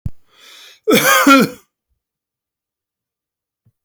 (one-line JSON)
{"cough_length": "3.8 s", "cough_amplitude": 32768, "cough_signal_mean_std_ratio": 0.35, "survey_phase": "beta (2021-08-13 to 2022-03-07)", "age": "45-64", "gender": "Male", "wearing_mask": "No", "symptom_runny_or_blocked_nose": true, "smoker_status": "Never smoked", "respiratory_condition_asthma": false, "respiratory_condition_other": false, "recruitment_source": "REACT", "submission_delay": "1 day", "covid_test_result": "Negative", "covid_test_method": "RT-qPCR"}